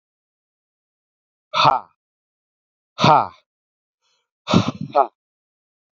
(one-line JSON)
{"exhalation_length": "6.0 s", "exhalation_amplitude": 28874, "exhalation_signal_mean_std_ratio": 0.27, "survey_phase": "beta (2021-08-13 to 2022-03-07)", "age": "18-44", "gender": "Male", "wearing_mask": "No", "symptom_none": true, "smoker_status": "Never smoked", "respiratory_condition_asthma": false, "respiratory_condition_other": false, "recruitment_source": "REACT", "submission_delay": "1 day", "covid_test_result": "Negative", "covid_test_method": "RT-qPCR", "influenza_a_test_result": "Negative", "influenza_b_test_result": "Negative"}